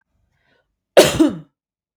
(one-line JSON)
{"cough_length": "2.0 s", "cough_amplitude": 32768, "cough_signal_mean_std_ratio": 0.3, "survey_phase": "beta (2021-08-13 to 2022-03-07)", "age": "18-44", "gender": "Female", "wearing_mask": "No", "symptom_none": true, "smoker_status": "Never smoked", "respiratory_condition_asthma": false, "respiratory_condition_other": false, "recruitment_source": "REACT", "submission_delay": "1 day", "covid_test_result": "Negative", "covid_test_method": "RT-qPCR", "influenza_a_test_result": "Unknown/Void", "influenza_b_test_result": "Unknown/Void"}